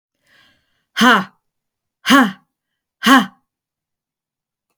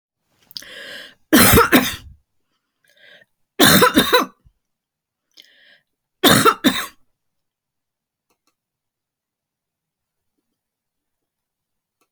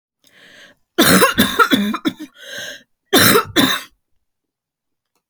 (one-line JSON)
{"exhalation_length": "4.8 s", "exhalation_amplitude": 31537, "exhalation_signal_mean_std_ratio": 0.31, "three_cough_length": "12.1 s", "three_cough_amplitude": 32768, "three_cough_signal_mean_std_ratio": 0.29, "cough_length": "5.3 s", "cough_amplitude": 32768, "cough_signal_mean_std_ratio": 0.45, "survey_phase": "alpha (2021-03-01 to 2021-08-12)", "age": "45-64", "gender": "Female", "wearing_mask": "No", "symptom_cough_any": true, "symptom_onset": "10 days", "smoker_status": "Never smoked", "respiratory_condition_asthma": false, "respiratory_condition_other": false, "recruitment_source": "REACT", "submission_delay": "1 day", "covid_test_result": "Negative", "covid_test_method": "RT-qPCR"}